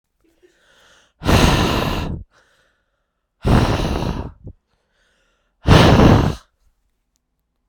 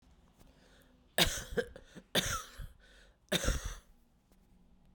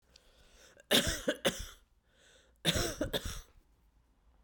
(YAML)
exhalation_length: 7.7 s
exhalation_amplitude: 32768
exhalation_signal_mean_std_ratio: 0.42
three_cough_length: 4.9 s
three_cough_amplitude: 9215
three_cough_signal_mean_std_ratio: 0.38
cough_length: 4.4 s
cough_amplitude: 7176
cough_signal_mean_std_ratio: 0.39
survey_phase: beta (2021-08-13 to 2022-03-07)
age: 45-64
gender: Female
wearing_mask: 'No'
symptom_fatigue: true
symptom_change_to_sense_of_smell_or_taste: true
symptom_onset: 4 days
smoker_status: Current smoker (e-cigarettes or vapes only)
respiratory_condition_asthma: false
respiratory_condition_other: false
recruitment_source: Test and Trace
submission_delay: 1 day
covid_test_result: Positive
covid_test_method: RT-qPCR
covid_ct_value: 14.0
covid_ct_gene: N gene
covid_ct_mean: 15.0
covid_viral_load: 12000000 copies/ml
covid_viral_load_category: High viral load (>1M copies/ml)